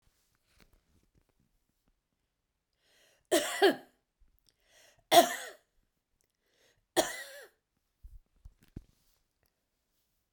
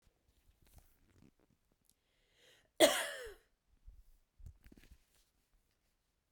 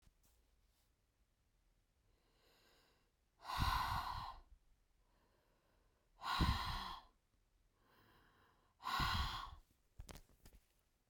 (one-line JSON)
{"three_cough_length": "10.3 s", "three_cough_amplitude": 14478, "three_cough_signal_mean_std_ratio": 0.2, "cough_length": "6.3 s", "cough_amplitude": 7938, "cough_signal_mean_std_ratio": 0.18, "exhalation_length": "11.1 s", "exhalation_amplitude": 1953, "exhalation_signal_mean_std_ratio": 0.38, "survey_phase": "beta (2021-08-13 to 2022-03-07)", "age": "45-64", "gender": "Female", "wearing_mask": "No", "symptom_cough_any": true, "symptom_runny_or_blocked_nose": true, "symptom_fever_high_temperature": true, "symptom_headache": true, "symptom_other": true, "symptom_onset": "2 days", "smoker_status": "Never smoked", "respiratory_condition_asthma": false, "respiratory_condition_other": false, "recruitment_source": "Test and Trace", "submission_delay": "1 day", "covid_test_result": "Positive", "covid_test_method": "RT-qPCR", "covid_ct_value": 14.9, "covid_ct_gene": "ORF1ab gene", "covid_ct_mean": 15.2, "covid_viral_load": "10000000 copies/ml", "covid_viral_load_category": "High viral load (>1M copies/ml)"}